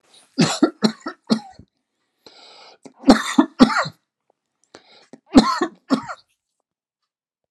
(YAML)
three_cough_length: 7.5 s
three_cough_amplitude: 32767
three_cough_signal_mean_std_ratio: 0.3
survey_phase: alpha (2021-03-01 to 2021-08-12)
age: 65+
gender: Male
wearing_mask: 'No'
symptom_none: true
smoker_status: Never smoked
respiratory_condition_asthma: false
respiratory_condition_other: true
recruitment_source: REACT
submission_delay: 1 day
covid_test_result: Negative
covid_test_method: RT-qPCR